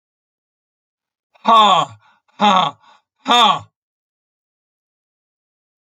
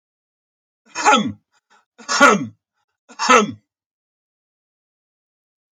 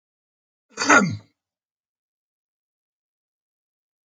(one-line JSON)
{"exhalation_length": "6.0 s", "exhalation_amplitude": 31128, "exhalation_signal_mean_std_ratio": 0.33, "three_cough_length": "5.7 s", "three_cough_amplitude": 32720, "three_cough_signal_mean_std_ratio": 0.3, "cough_length": "4.1 s", "cough_amplitude": 29038, "cough_signal_mean_std_ratio": 0.21, "survey_phase": "alpha (2021-03-01 to 2021-08-12)", "age": "65+", "gender": "Male", "wearing_mask": "No", "symptom_fatigue": true, "smoker_status": "Ex-smoker", "respiratory_condition_asthma": false, "respiratory_condition_other": false, "recruitment_source": "REACT", "submission_delay": "1 day", "covid_test_result": "Negative", "covid_test_method": "RT-qPCR"}